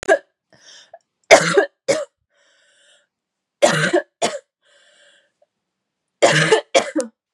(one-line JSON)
{"three_cough_length": "7.3 s", "three_cough_amplitude": 32768, "three_cough_signal_mean_std_ratio": 0.36, "survey_phase": "beta (2021-08-13 to 2022-03-07)", "age": "18-44", "gender": "Female", "wearing_mask": "No", "symptom_cough_any": true, "symptom_new_continuous_cough": true, "symptom_runny_or_blocked_nose": true, "symptom_shortness_of_breath": true, "symptom_sore_throat": true, "symptom_abdominal_pain": true, "symptom_diarrhoea": true, "symptom_fatigue": true, "symptom_fever_high_temperature": true, "symptom_headache": true, "symptom_change_to_sense_of_smell_or_taste": true, "symptom_loss_of_taste": true, "symptom_onset": "2 days", "smoker_status": "Never smoked", "respiratory_condition_asthma": false, "respiratory_condition_other": false, "recruitment_source": "Test and Trace", "submission_delay": "2 days", "covid_test_result": "Positive", "covid_test_method": "RT-qPCR", "covid_ct_value": 18.5, "covid_ct_gene": "ORF1ab gene", "covid_ct_mean": 19.1, "covid_viral_load": "560000 copies/ml", "covid_viral_load_category": "Low viral load (10K-1M copies/ml)"}